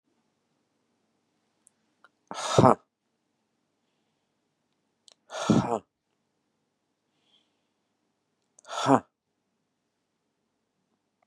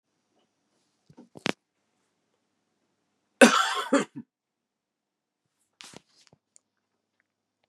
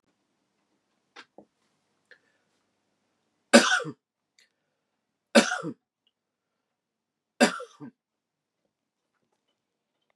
{"exhalation_length": "11.3 s", "exhalation_amplitude": 23872, "exhalation_signal_mean_std_ratio": 0.19, "cough_length": "7.7 s", "cough_amplitude": 27678, "cough_signal_mean_std_ratio": 0.18, "three_cough_length": "10.2 s", "three_cough_amplitude": 30317, "three_cough_signal_mean_std_ratio": 0.18, "survey_phase": "beta (2021-08-13 to 2022-03-07)", "age": "45-64", "gender": "Male", "wearing_mask": "No", "symptom_cough_any": true, "symptom_runny_or_blocked_nose": true, "symptom_fatigue": true, "symptom_headache": true, "symptom_onset": "3 days", "smoker_status": "Ex-smoker", "respiratory_condition_asthma": false, "respiratory_condition_other": false, "recruitment_source": "Test and Trace", "submission_delay": "2 days", "covid_test_result": "Positive", "covid_test_method": "RT-qPCR", "covid_ct_value": 18.2, "covid_ct_gene": "ORF1ab gene"}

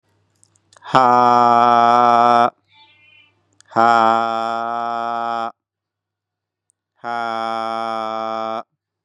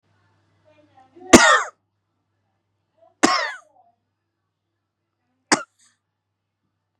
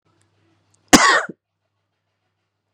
{"exhalation_length": "9.0 s", "exhalation_amplitude": 32768, "exhalation_signal_mean_std_ratio": 0.46, "three_cough_length": "7.0 s", "three_cough_amplitude": 32768, "three_cough_signal_mean_std_ratio": 0.21, "cough_length": "2.7 s", "cough_amplitude": 32768, "cough_signal_mean_std_ratio": 0.25, "survey_phase": "beta (2021-08-13 to 2022-03-07)", "age": "18-44", "gender": "Male", "wearing_mask": "Yes", "symptom_none": true, "smoker_status": "Never smoked", "respiratory_condition_asthma": false, "respiratory_condition_other": false, "recruitment_source": "REACT", "submission_delay": "3 days", "covid_test_result": "Negative", "covid_test_method": "RT-qPCR", "influenza_a_test_result": "Negative", "influenza_b_test_result": "Negative"}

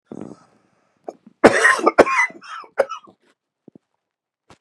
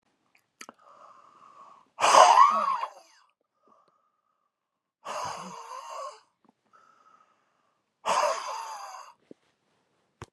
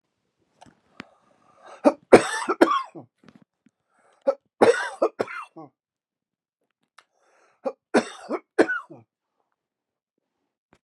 {"cough_length": "4.6 s", "cough_amplitude": 32768, "cough_signal_mean_std_ratio": 0.31, "exhalation_length": "10.3 s", "exhalation_amplitude": 23736, "exhalation_signal_mean_std_ratio": 0.29, "three_cough_length": "10.8 s", "three_cough_amplitude": 32768, "three_cough_signal_mean_std_ratio": 0.25, "survey_phase": "beta (2021-08-13 to 2022-03-07)", "age": "65+", "gender": "Male", "wearing_mask": "No", "symptom_none": true, "smoker_status": "Never smoked", "respiratory_condition_asthma": false, "respiratory_condition_other": false, "recruitment_source": "REACT", "submission_delay": "1 day", "covid_test_result": "Negative", "covid_test_method": "RT-qPCR", "influenza_a_test_result": "Negative", "influenza_b_test_result": "Negative"}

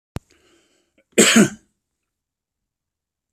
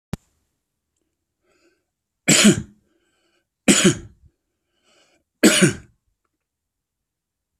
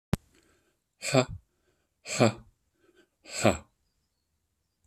{"cough_length": "3.3 s", "cough_amplitude": 30374, "cough_signal_mean_std_ratio": 0.25, "three_cough_length": "7.6 s", "three_cough_amplitude": 32368, "three_cough_signal_mean_std_ratio": 0.27, "exhalation_length": "4.9 s", "exhalation_amplitude": 14628, "exhalation_signal_mean_std_ratio": 0.26, "survey_phase": "beta (2021-08-13 to 2022-03-07)", "age": "65+", "gender": "Male", "wearing_mask": "No", "symptom_none": true, "smoker_status": "Ex-smoker", "respiratory_condition_asthma": false, "respiratory_condition_other": false, "recruitment_source": "REACT", "submission_delay": "1 day", "covid_test_result": "Negative", "covid_test_method": "RT-qPCR", "influenza_a_test_result": "Negative", "influenza_b_test_result": "Negative"}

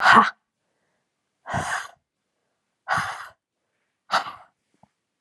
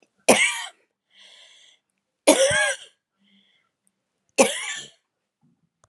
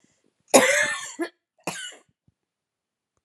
{"exhalation_length": "5.2 s", "exhalation_amplitude": 29848, "exhalation_signal_mean_std_ratio": 0.29, "three_cough_length": "5.9 s", "three_cough_amplitude": 32437, "three_cough_signal_mean_std_ratio": 0.32, "cough_length": "3.2 s", "cough_amplitude": 31369, "cough_signal_mean_std_ratio": 0.32, "survey_phase": "alpha (2021-03-01 to 2021-08-12)", "age": "45-64", "gender": "Female", "wearing_mask": "No", "symptom_cough_any": true, "symptom_fatigue": true, "symptom_headache": true, "symptom_onset": "3 days", "smoker_status": "Never smoked", "respiratory_condition_asthma": false, "respiratory_condition_other": false, "recruitment_source": "Test and Trace", "submission_delay": "2 days", "covid_test_result": "Positive", "covid_test_method": "RT-qPCR"}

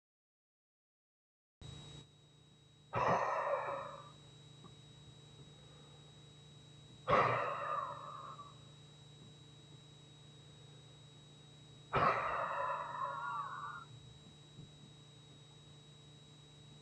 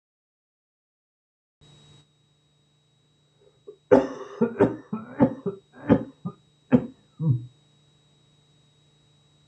{"exhalation_length": "16.8 s", "exhalation_amplitude": 3903, "exhalation_signal_mean_std_ratio": 0.47, "cough_length": "9.5 s", "cough_amplitude": 25037, "cough_signal_mean_std_ratio": 0.27, "survey_phase": "beta (2021-08-13 to 2022-03-07)", "age": "65+", "gender": "Male", "wearing_mask": "No", "symptom_cough_any": true, "symptom_shortness_of_breath": true, "symptom_loss_of_taste": true, "symptom_onset": "12 days", "smoker_status": "Ex-smoker", "respiratory_condition_asthma": false, "respiratory_condition_other": true, "recruitment_source": "REACT", "submission_delay": "2 days", "covid_test_result": "Negative", "covid_test_method": "RT-qPCR"}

